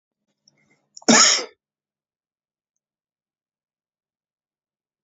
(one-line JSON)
{"cough_length": "5.0 s", "cough_amplitude": 32768, "cough_signal_mean_std_ratio": 0.2, "survey_phase": "beta (2021-08-13 to 2022-03-07)", "age": "45-64", "gender": "Male", "wearing_mask": "No", "symptom_none": true, "symptom_onset": "5 days", "smoker_status": "Ex-smoker", "respiratory_condition_asthma": false, "respiratory_condition_other": false, "recruitment_source": "REACT", "submission_delay": "1 day", "covid_test_result": "Negative", "covid_test_method": "RT-qPCR", "influenza_a_test_result": "Negative", "influenza_b_test_result": "Negative"}